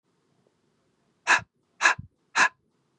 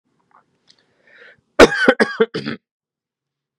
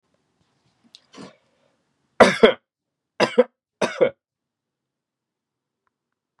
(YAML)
exhalation_length: 3.0 s
exhalation_amplitude: 20575
exhalation_signal_mean_std_ratio: 0.28
cough_length: 3.6 s
cough_amplitude: 32768
cough_signal_mean_std_ratio: 0.27
three_cough_length: 6.4 s
three_cough_amplitude: 32768
three_cough_signal_mean_std_ratio: 0.21
survey_phase: beta (2021-08-13 to 2022-03-07)
age: 18-44
gender: Male
wearing_mask: 'No'
symptom_cough_any: true
symptom_sore_throat: true
symptom_headache: true
symptom_onset: 3 days
smoker_status: Never smoked
respiratory_condition_asthma: false
respiratory_condition_other: false
recruitment_source: Test and Trace
submission_delay: 2 days
covid_test_result: Positive
covid_test_method: RT-qPCR
covid_ct_value: 18.2
covid_ct_gene: N gene